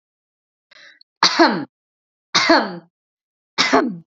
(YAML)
three_cough_length: 4.2 s
three_cough_amplitude: 32767
three_cough_signal_mean_std_ratio: 0.39
survey_phase: beta (2021-08-13 to 2022-03-07)
age: 45-64
gender: Female
wearing_mask: 'No'
symptom_none: true
smoker_status: Never smoked
respiratory_condition_asthma: false
respiratory_condition_other: false
recruitment_source: REACT
submission_delay: 4 days
covid_test_result: Negative
covid_test_method: RT-qPCR
influenza_a_test_result: Negative
influenza_b_test_result: Negative